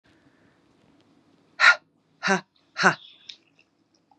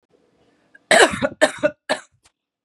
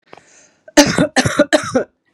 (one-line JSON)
{"exhalation_length": "4.2 s", "exhalation_amplitude": 27704, "exhalation_signal_mean_std_ratio": 0.24, "three_cough_length": "2.6 s", "three_cough_amplitude": 32767, "three_cough_signal_mean_std_ratio": 0.33, "cough_length": "2.1 s", "cough_amplitude": 32768, "cough_signal_mean_std_ratio": 0.45, "survey_phase": "beta (2021-08-13 to 2022-03-07)", "age": "45-64", "gender": "Female", "wearing_mask": "No", "symptom_cough_any": true, "symptom_new_continuous_cough": true, "symptom_runny_or_blocked_nose": true, "symptom_shortness_of_breath": true, "symptom_sore_throat": true, "symptom_abdominal_pain": true, "symptom_fatigue": true, "symptom_fever_high_temperature": true, "symptom_headache": true, "symptom_change_to_sense_of_smell_or_taste": true, "symptom_loss_of_taste": true, "symptom_onset": "5 days", "smoker_status": "Ex-smoker", "respiratory_condition_asthma": false, "respiratory_condition_other": false, "recruitment_source": "Test and Trace", "submission_delay": "2 days", "covid_test_result": "Positive", "covid_test_method": "ePCR"}